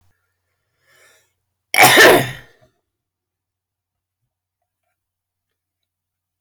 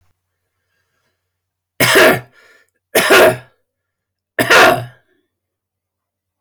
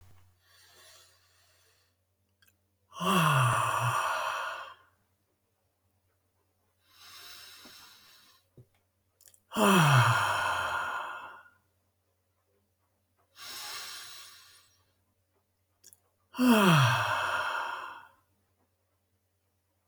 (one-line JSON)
{"cough_length": "6.4 s", "cough_amplitude": 32767, "cough_signal_mean_std_ratio": 0.24, "three_cough_length": "6.4 s", "three_cough_amplitude": 32767, "three_cough_signal_mean_std_ratio": 0.37, "exhalation_length": "19.9 s", "exhalation_amplitude": 11253, "exhalation_signal_mean_std_ratio": 0.4, "survey_phase": "alpha (2021-03-01 to 2021-08-12)", "age": "65+", "gender": "Male", "wearing_mask": "No", "symptom_none": true, "smoker_status": "Ex-smoker", "respiratory_condition_asthma": true, "respiratory_condition_other": false, "recruitment_source": "REACT", "submission_delay": "2 days", "covid_test_result": "Negative", "covid_test_method": "RT-qPCR"}